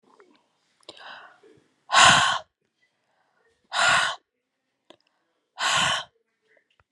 exhalation_length: 6.9 s
exhalation_amplitude: 25356
exhalation_signal_mean_std_ratio: 0.33
survey_phase: beta (2021-08-13 to 2022-03-07)
age: 45-64
gender: Female
wearing_mask: 'No'
symptom_none: true
smoker_status: Never smoked
respiratory_condition_asthma: false
respiratory_condition_other: false
recruitment_source: REACT
submission_delay: 1 day
covid_test_result: Negative
covid_test_method: RT-qPCR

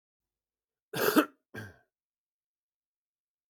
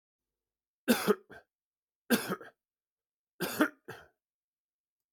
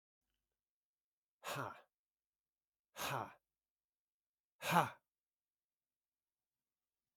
cough_length: 3.5 s
cough_amplitude: 10926
cough_signal_mean_std_ratio: 0.22
three_cough_length: 5.1 s
three_cough_amplitude: 8401
three_cough_signal_mean_std_ratio: 0.27
exhalation_length: 7.2 s
exhalation_amplitude: 4474
exhalation_signal_mean_std_ratio: 0.22
survey_phase: beta (2021-08-13 to 2022-03-07)
age: 45-64
gender: Male
wearing_mask: 'No'
symptom_none: true
smoker_status: Current smoker (11 or more cigarettes per day)
respiratory_condition_asthma: false
respiratory_condition_other: false
recruitment_source: REACT
submission_delay: 1 day
covid_test_result: Negative
covid_test_method: RT-qPCR
influenza_a_test_result: Negative
influenza_b_test_result: Negative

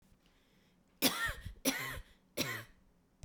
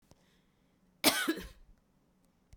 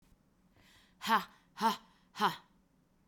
three_cough_length: 3.2 s
three_cough_amplitude: 5319
three_cough_signal_mean_std_ratio: 0.43
cough_length: 2.6 s
cough_amplitude: 11327
cough_signal_mean_std_ratio: 0.28
exhalation_length: 3.1 s
exhalation_amplitude: 5230
exhalation_signal_mean_std_ratio: 0.33
survey_phase: beta (2021-08-13 to 2022-03-07)
age: 45-64
gender: Female
wearing_mask: 'No'
symptom_none: true
symptom_onset: 8 days
smoker_status: Never smoked
respiratory_condition_asthma: false
respiratory_condition_other: false
recruitment_source: REACT
submission_delay: 3 days
covid_test_result: Negative
covid_test_method: RT-qPCR
influenza_a_test_result: Unknown/Void
influenza_b_test_result: Unknown/Void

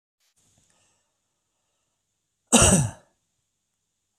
cough_length: 4.2 s
cough_amplitude: 29283
cough_signal_mean_std_ratio: 0.23
survey_phase: beta (2021-08-13 to 2022-03-07)
age: 45-64
gender: Male
wearing_mask: 'No'
symptom_none: true
smoker_status: Never smoked
respiratory_condition_asthma: false
respiratory_condition_other: false
recruitment_source: REACT
submission_delay: 1 day
covid_test_result: Negative
covid_test_method: RT-qPCR
influenza_a_test_result: Negative
influenza_b_test_result: Negative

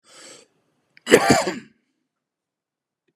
cough_length: 3.2 s
cough_amplitude: 32768
cough_signal_mean_std_ratio: 0.27
survey_phase: beta (2021-08-13 to 2022-03-07)
age: 65+
gender: Male
wearing_mask: 'No'
symptom_headache: true
smoker_status: Never smoked
respiratory_condition_asthma: false
respiratory_condition_other: false
recruitment_source: Test and Trace
submission_delay: 1 day
covid_test_result: Negative
covid_test_method: RT-qPCR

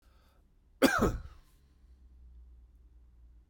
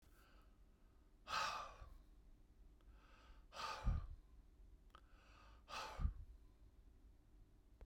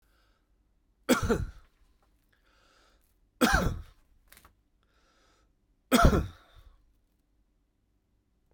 cough_length: 3.5 s
cough_amplitude: 10135
cough_signal_mean_std_ratio: 0.3
exhalation_length: 7.9 s
exhalation_amplitude: 1200
exhalation_signal_mean_std_ratio: 0.46
three_cough_length: 8.5 s
three_cough_amplitude: 16562
three_cough_signal_mean_std_ratio: 0.27
survey_phase: beta (2021-08-13 to 2022-03-07)
age: 65+
gender: Male
wearing_mask: 'No'
symptom_cough_any: true
symptom_runny_or_blocked_nose: true
symptom_headache: true
smoker_status: Ex-smoker
respiratory_condition_asthma: true
respiratory_condition_other: true
recruitment_source: REACT
submission_delay: 0 days
covid_test_result: Negative
covid_test_method: RT-qPCR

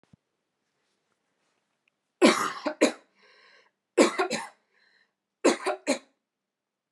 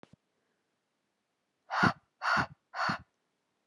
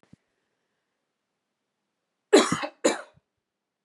three_cough_length: 6.9 s
three_cough_amplitude: 17571
three_cough_signal_mean_std_ratio: 0.29
exhalation_length: 3.7 s
exhalation_amplitude: 8457
exhalation_signal_mean_std_ratio: 0.33
cough_length: 3.8 s
cough_amplitude: 17999
cough_signal_mean_std_ratio: 0.22
survey_phase: alpha (2021-03-01 to 2021-08-12)
age: 18-44
gender: Female
wearing_mask: 'No'
symptom_none: true
smoker_status: Never smoked
respiratory_condition_asthma: false
respiratory_condition_other: false
recruitment_source: REACT
submission_delay: 1 day
covid_test_result: Negative
covid_test_method: RT-qPCR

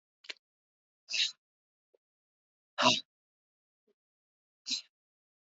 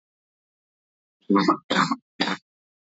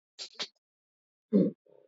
exhalation_length: 5.5 s
exhalation_amplitude: 8640
exhalation_signal_mean_std_ratio: 0.22
three_cough_length: 3.0 s
three_cough_amplitude: 15099
three_cough_signal_mean_std_ratio: 0.36
cough_length: 1.9 s
cough_amplitude: 8582
cough_signal_mean_std_ratio: 0.29
survey_phase: alpha (2021-03-01 to 2021-08-12)
age: 18-44
gender: Male
wearing_mask: 'No'
symptom_cough_any: true
symptom_fatigue: true
symptom_headache: true
symptom_loss_of_taste: true
symptom_onset: 2 days
smoker_status: Never smoked
respiratory_condition_asthma: false
respiratory_condition_other: false
recruitment_source: Test and Trace
submission_delay: 1 day
covid_ct_value: 26.6
covid_ct_gene: ORF1ab gene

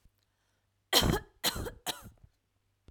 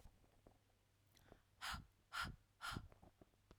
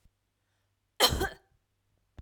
three_cough_length: 2.9 s
three_cough_amplitude: 9839
three_cough_signal_mean_std_ratio: 0.34
exhalation_length: 3.6 s
exhalation_amplitude: 682
exhalation_signal_mean_std_ratio: 0.43
cough_length: 2.2 s
cough_amplitude: 14121
cough_signal_mean_std_ratio: 0.27
survey_phase: alpha (2021-03-01 to 2021-08-12)
age: 45-64
gender: Female
wearing_mask: 'No'
symptom_none: true
smoker_status: Ex-smoker
respiratory_condition_asthma: false
respiratory_condition_other: false
recruitment_source: REACT
submission_delay: 2 days
covid_test_result: Negative
covid_test_method: RT-qPCR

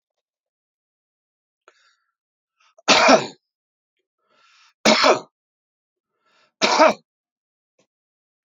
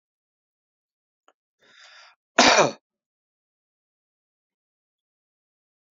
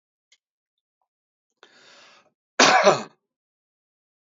three_cough_length: 8.4 s
three_cough_amplitude: 29640
three_cough_signal_mean_std_ratio: 0.26
exhalation_length: 6.0 s
exhalation_amplitude: 28455
exhalation_signal_mean_std_ratio: 0.18
cough_length: 4.4 s
cough_amplitude: 27354
cough_signal_mean_std_ratio: 0.24
survey_phase: beta (2021-08-13 to 2022-03-07)
age: 65+
gender: Male
wearing_mask: 'No'
symptom_none: true
smoker_status: Ex-smoker
respiratory_condition_asthma: false
respiratory_condition_other: false
recruitment_source: REACT
submission_delay: 2 days
covid_test_result: Negative
covid_test_method: RT-qPCR
influenza_a_test_result: Negative
influenza_b_test_result: Negative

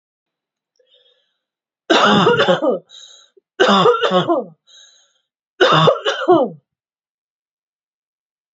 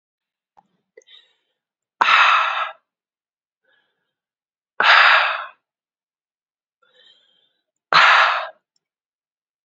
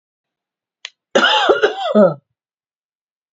three_cough_length: 8.5 s
three_cough_amplitude: 32343
three_cough_signal_mean_std_ratio: 0.44
exhalation_length: 9.6 s
exhalation_amplitude: 29741
exhalation_signal_mean_std_ratio: 0.33
cough_length: 3.3 s
cough_amplitude: 29725
cough_signal_mean_std_ratio: 0.41
survey_phase: alpha (2021-03-01 to 2021-08-12)
age: 18-44
gender: Female
wearing_mask: 'No'
symptom_fatigue: true
symptom_change_to_sense_of_smell_or_taste: true
symptom_loss_of_taste: true
smoker_status: Ex-smoker
respiratory_condition_asthma: false
respiratory_condition_other: false
recruitment_source: Test and Trace
submission_delay: 1 day
covid_test_result: Positive
covid_test_method: RT-qPCR
covid_ct_value: 13.3
covid_ct_gene: ORF1ab gene
covid_ct_mean: 13.7
covid_viral_load: 32000000 copies/ml
covid_viral_load_category: High viral load (>1M copies/ml)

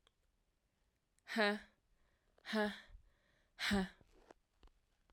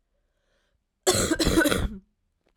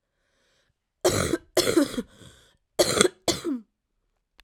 exhalation_length: 5.1 s
exhalation_amplitude: 2402
exhalation_signal_mean_std_ratio: 0.34
cough_length: 2.6 s
cough_amplitude: 16859
cough_signal_mean_std_ratio: 0.46
three_cough_length: 4.4 s
three_cough_amplitude: 32767
three_cough_signal_mean_std_ratio: 0.4
survey_phase: alpha (2021-03-01 to 2021-08-12)
age: 18-44
gender: Female
wearing_mask: 'No'
symptom_cough_any: true
symptom_new_continuous_cough: true
symptom_fatigue: true
symptom_headache: true
symptom_change_to_sense_of_smell_or_taste: true
symptom_loss_of_taste: true
symptom_onset: 3 days
smoker_status: Ex-smoker
respiratory_condition_asthma: false
respiratory_condition_other: false
recruitment_source: Test and Trace
submission_delay: 1 day
covid_test_result: Positive
covid_test_method: RT-qPCR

